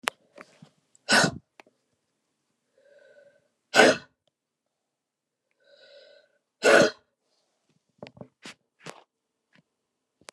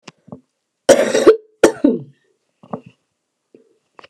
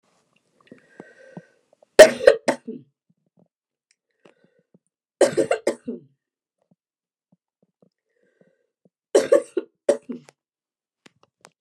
{
  "exhalation_length": "10.3 s",
  "exhalation_amplitude": 25499,
  "exhalation_signal_mean_std_ratio": 0.21,
  "cough_length": "4.1 s",
  "cough_amplitude": 29204,
  "cough_signal_mean_std_ratio": 0.31,
  "three_cough_length": "11.6 s",
  "three_cough_amplitude": 29204,
  "three_cough_signal_mean_std_ratio": 0.19,
  "survey_phase": "beta (2021-08-13 to 2022-03-07)",
  "age": "65+",
  "gender": "Female",
  "wearing_mask": "No",
  "symptom_cough_any": true,
  "symptom_new_continuous_cough": true,
  "symptom_runny_or_blocked_nose": true,
  "symptom_fatigue": true,
  "symptom_onset": "4 days",
  "smoker_status": "Never smoked",
  "respiratory_condition_asthma": true,
  "respiratory_condition_other": false,
  "recruitment_source": "Test and Trace",
  "submission_delay": "2 days",
  "covid_test_method": "RT-qPCR",
  "covid_ct_value": 26.7,
  "covid_ct_gene": "ORF1ab gene"
}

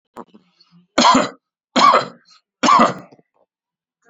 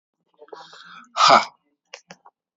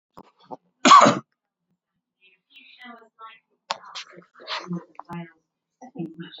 {
  "three_cough_length": "4.1 s",
  "three_cough_amplitude": 31754,
  "three_cough_signal_mean_std_ratio": 0.39,
  "exhalation_length": "2.6 s",
  "exhalation_amplitude": 28203,
  "exhalation_signal_mean_std_ratio": 0.27,
  "cough_length": "6.4 s",
  "cough_amplitude": 30626,
  "cough_signal_mean_std_ratio": 0.23,
  "survey_phase": "alpha (2021-03-01 to 2021-08-12)",
  "age": "45-64",
  "gender": "Male",
  "wearing_mask": "No",
  "symptom_none": true,
  "smoker_status": "Never smoked",
  "respiratory_condition_asthma": false,
  "respiratory_condition_other": false,
  "recruitment_source": "REACT",
  "submission_delay": "1 day",
  "covid_test_result": "Negative",
  "covid_test_method": "RT-qPCR"
}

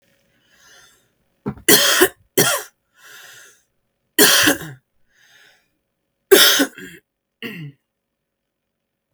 {
  "three_cough_length": "9.1 s",
  "three_cough_amplitude": 32768,
  "three_cough_signal_mean_std_ratio": 0.32,
  "survey_phase": "beta (2021-08-13 to 2022-03-07)",
  "age": "18-44",
  "gender": "Female",
  "wearing_mask": "No",
  "symptom_cough_any": true,
  "symptom_runny_or_blocked_nose": true,
  "symptom_onset": "13 days",
  "smoker_status": "Ex-smoker",
  "respiratory_condition_asthma": false,
  "respiratory_condition_other": false,
  "recruitment_source": "REACT",
  "submission_delay": "2 days",
  "covid_test_result": "Negative",
  "covid_test_method": "RT-qPCR",
  "influenza_a_test_result": "Negative",
  "influenza_b_test_result": "Negative"
}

